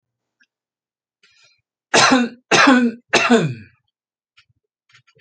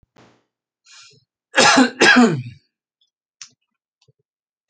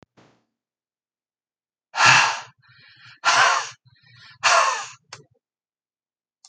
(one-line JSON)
{"three_cough_length": "5.2 s", "three_cough_amplitude": 32133, "three_cough_signal_mean_std_ratio": 0.38, "cough_length": "4.7 s", "cough_amplitude": 32281, "cough_signal_mean_std_ratio": 0.32, "exhalation_length": "6.5 s", "exhalation_amplitude": 32767, "exhalation_signal_mean_std_ratio": 0.35, "survey_phase": "alpha (2021-03-01 to 2021-08-12)", "age": "65+", "gender": "Male", "wearing_mask": "No", "symptom_none": true, "smoker_status": "Never smoked", "respiratory_condition_asthma": false, "respiratory_condition_other": false, "recruitment_source": "REACT", "submission_delay": "1 day", "covid_test_result": "Negative", "covid_test_method": "RT-qPCR"}